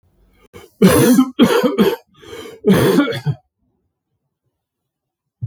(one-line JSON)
{"cough_length": "5.5 s", "cough_amplitude": 32768, "cough_signal_mean_std_ratio": 0.46, "survey_phase": "beta (2021-08-13 to 2022-03-07)", "age": "45-64", "gender": "Male", "wearing_mask": "No", "symptom_cough_any": true, "symptom_new_continuous_cough": true, "symptom_change_to_sense_of_smell_or_taste": true, "symptom_onset": "8 days", "smoker_status": "Never smoked", "respiratory_condition_asthma": false, "respiratory_condition_other": false, "recruitment_source": "Test and Trace", "submission_delay": "3 days", "covid_test_result": "Positive", "covid_test_method": "RT-qPCR", "covid_ct_value": 20.2, "covid_ct_gene": "ORF1ab gene"}